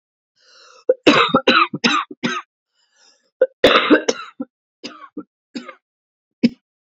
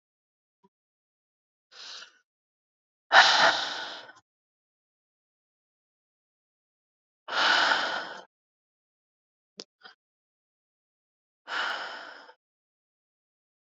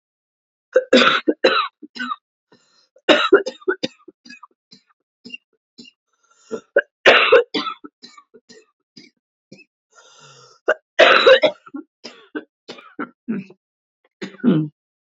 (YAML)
cough_length: 6.8 s
cough_amplitude: 32767
cough_signal_mean_std_ratio: 0.37
exhalation_length: 13.7 s
exhalation_amplitude: 23441
exhalation_signal_mean_std_ratio: 0.26
three_cough_length: 15.1 s
three_cough_amplitude: 32767
three_cough_signal_mean_std_ratio: 0.33
survey_phase: beta (2021-08-13 to 2022-03-07)
age: 18-44
gender: Female
wearing_mask: 'No'
symptom_new_continuous_cough: true
symptom_runny_or_blocked_nose: true
symptom_sore_throat: true
symptom_abdominal_pain: true
symptom_fatigue: true
symptom_fever_high_temperature: true
symptom_headache: true
symptom_onset: 3 days
smoker_status: Never smoked
respiratory_condition_asthma: false
respiratory_condition_other: false
recruitment_source: Test and Trace
submission_delay: 2 days
covid_test_result: Positive
covid_test_method: RT-qPCR
covid_ct_value: 25.1
covid_ct_gene: ORF1ab gene
covid_ct_mean: 25.3
covid_viral_load: 4900 copies/ml
covid_viral_load_category: Minimal viral load (< 10K copies/ml)